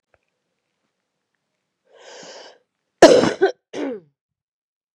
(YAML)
cough_length: 4.9 s
cough_amplitude: 32768
cough_signal_mean_std_ratio: 0.23
survey_phase: beta (2021-08-13 to 2022-03-07)
age: 18-44
gender: Female
wearing_mask: 'No'
symptom_cough_any: true
symptom_runny_or_blocked_nose: true
smoker_status: Ex-smoker
respiratory_condition_asthma: false
respiratory_condition_other: false
recruitment_source: Test and Trace
submission_delay: 1 day
covid_test_result: Positive
covid_test_method: LFT